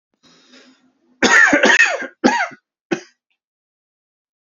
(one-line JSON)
{"three_cough_length": "4.4 s", "three_cough_amplitude": 32767, "three_cough_signal_mean_std_ratio": 0.39, "survey_phase": "beta (2021-08-13 to 2022-03-07)", "age": "18-44", "gender": "Male", "wearing_mask": "No", "symptom_cough_any": true, "symptom_runny_or_blocked_nose": true, "symptom_shortness_of_breath": true, "symptom_fatigue": true, "symptom_onset": "3 days", "smoker_status": "Ex-smoker", "respiratory_condition_asthma": true, "respiratory_condition_other": false, "recruitment_source": "Test and Trace", "submission_delay": "1 day", "covid_test_result": "Positive", "covid_test_method": "RT-qPCR", "covid_ct_value": 20.6, "covid_ct_gene": "ORF1ab gene", "covid_ct_mean": 21.1, "covid_viral_load": "120000 copies/ml", "covid_viral_load_category": "Low viral load (10K-1M copies/ml)"}